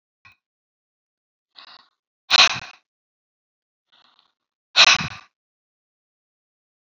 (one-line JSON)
{"exhalation_length": "6.8 s", "exhalation_amplitude": 32768, "exhalation_signal_mean_std_ratio": 0.2, "survey_phase": "beta (2021-08-13 to 2022-03-07)", "age": "65+", "gender": "Female", "wearing_mask": "No", "symptom_none": true, "smoker_status": "Never smoked", "respiratory_condition_asthma": false, "respiratory_condition_other": false, "recruitment_source": "Test and Trace", "submission_delay": "0 days", "covid_test_result": "Negative", "covid_test_method": "LFT"}